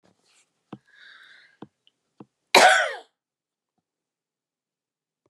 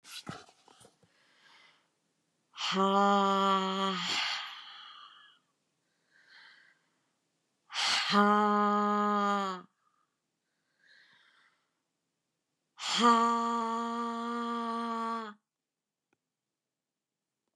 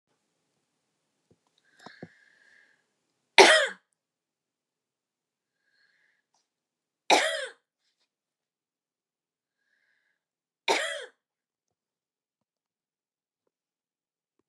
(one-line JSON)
{"cough_length": "5.3 s", "cough_amplitude": 32768, "cough_signal_mean_std_ratio": 0.21, "exhalation_length": "17.6 s", "exhalation_amplitude": 9371, "exhalation_signal_mean_std_ratio": 0.46, "three_cough_length": "14.5 s", "three_cough_amplitude": 30407, "three_cough_signal_mean_std_ratio": 0.16, "survey_phase": "beta (2021-08-13 to 2022-03-07)", "age": "45-64", "gender": "Female", "wearing_mask": "No", "symptom_none": true, "smoker_status": "Ex-smoker", "respiratory_condition_asthma": false, "respiratory_condition_other": false, "recruitment_source": "REACT", "submission_delay": "10 days", "covid_test_result": "Negative", "covid_test_method": "RT-qPCR", "influenza_a_test_result": "Negative", "influenza_b_test_result": "Negative"}